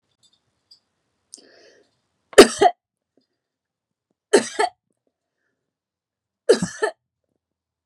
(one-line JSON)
{"three_cough_length": "7.9 s", "three_cough_amplitude": 32768, "three_cough_signal_mean_std_ratio": 0.19, "survey_phase": "beta (2021-08-13 to 2022-03-07)", "age": "45-64", "gender": "Female", "wearing_mask": "No", "symptom_runny_or_blocked_nose": true, "smoker_status": "Never smoked", "respiratory_condition_asthma": false, "respiratory_condition_other": false, "recruitment_source": "REACT", "submission_delay": "2 days", "covid_test_result": "Negative", "covid_test_method": "RT-qPCR"}